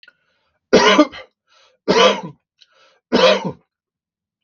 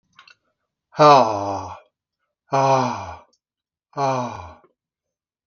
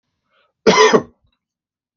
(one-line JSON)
{"three_cough_length": "4.4 s", "three_cough_amplitude": 32768, "three_cough_signal_mean_std_ratio": 0.38, "exhalation_length": "5.5 s", "exhalation_amplitude": 32768, "exhalation_signal_mean_std_ratio": 0.37, "cough_length": "2.0 s", "cough_amplitude": 32768, "cough_signal_mean_std_ratio": 0.34, "survey_phase": "beta (2021-08-13 to 2022-03-07)", "age": "45-64", "gender": "Male", "wearing_mask": "No", "symptom_sore_throat": true, "symptom_onset": "11 days", "smoker_status": "Never smoked", "respiratory_condition_asthma": false, "respiratory_condition_other": false, "recruitment_source": "REACT", "submission_delay": "0 days", "covid_test_result": "Negative", "covid_test_method": "RT-qPCR"}